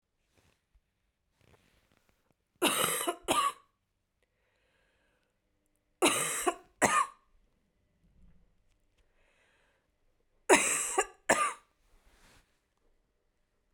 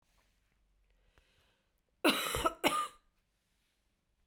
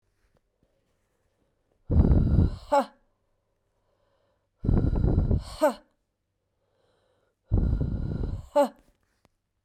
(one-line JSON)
{"three_cough_length": "13.7 s", "three_cough_amplitude": 13269, "three_cough_signal_mean_std_ratio": 0.3, "cough_length": "4.3 s", "cough_amplitude": 6631, "cough_signal_mean_std_ratio": 0.3, "exhalation_length": "9.6 s", "exhalation_amplitude": 12890, "exhalation_signal_mean_std_ratio": 0.42, "survey_phase": "beta (2021-08-13 to 2022-03-07)", "age": "18-44", "gender": "Female", "wearing_mask": "No", "symptom_cough_any": true, "symptom_new_continuous_cough": true, "symptom_runny_or_blocked_nose": true, "symptom_sore_throat": true, "symptom_fatigue": true, "symptom_fever_high_temperature": true, "symptom_headache": true, "smoker_status": "Never smoked", "respiratory_condition_asthma": false, "respiratory_condition_other": false, "recruitment_source": "Test and Trace", "submission_delay": "1 day", "covid_test_result": "Positive", "covid_test_method": "RT-qPCR", "covid_ct_value": 15.4, "covid_ct_gene": "ORF1ab gene", "covid_ct_mean": 16.0, "covid_viral_load": "5700000 copies/ml", "covid_viral_load_category": "High viral load (>1M copies/ml)"}